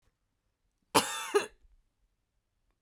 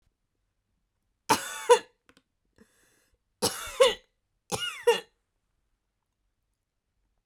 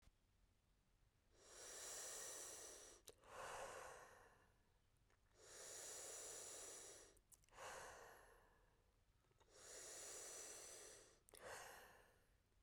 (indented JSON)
{
  "cough_length": "2.8 s",
  "cough_amplitude": 11400,
  "cough_signal_mean_std_ratio": 0.26,
  "three_cough_length": "7.3 s",
  "three_cough_amplitude": 16592,
  "three_cough_signal_mean_std_ratio": 0.24,
  "exhalation_length": "12.6 s",
  "exhalation_amplitude": 287,
  "exhalation_signal_mean_std_ratio": 0.75,
  "survey_phase": "beta (2021-08-13 to 2022-03-07)",
  "age": "45-64",
  "gender": "Female",
  "wearing_mask": "No",
  "symptom_none": true,
  "smoker_status": "Never smoked",
  "respiratory_condition_asthma": false,
  "respiratory_condition_other": false,
  "recruitment_source": "REACT",
  "submission_delay": "0 days",
  "covid_test_result": "Negative",
  "covid_test_method": "RT-qPCR"
}